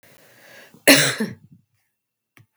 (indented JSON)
{
  "cough_length": "2.6 s",
  "cough_amplitude": 32768,
  "cough_signal_mean_std_ratio": 0.28,
  "survey_phase": "beta (2021-08-13 to 2022-03-07)",
  "age": "45-64",
  "gender": "Female",
  "wearing_mask": "No",
  "symptom_cough_any": true,
  "symptom_runny_or_blocked_nose": true,
  "symptom_sore_throat": true,
  "symptom_onset": "2 days",
  "smoker_status": "Ex-smoker",
  "respiratory_condition_asthma": false,
  "respiratory_condition_other": false,
  "recruitment_source": "Test and Trace",
  "submission_delay": "1 day",
  "covid_test_result": "Negative",
  "covid_test_method": "ePCR"
}